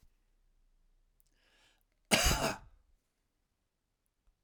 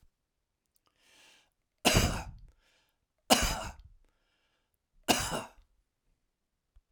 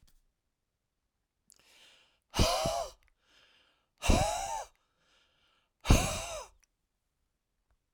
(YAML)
cough_length: 4.4 s
cough_amplitude: 10317
cough_signal_mean_std_ratio: 0.25
three_cough_length: 6.9 s
three_cough_amplitude: 15361
three_cough_signal_mean_std_ratio: 0.29
exhalation_length: 7.9 s
exhalation_amplitude: 13746
exhalation_signal_mean_std_ratio: 0.31
survey_phase: alpha (2021-03-01 to 2021-08-12)
age: 65+
gender: Male
wearing_mask: 'No'
symptom_none: true
smoker_status: Never smoked
respiratory_condition_asthma: false
respiratory_condition_other: false
recruitment_source: REACT
submission_delay: 3 days
covid_test_result: Negative
covid_test_method: RT-qPCR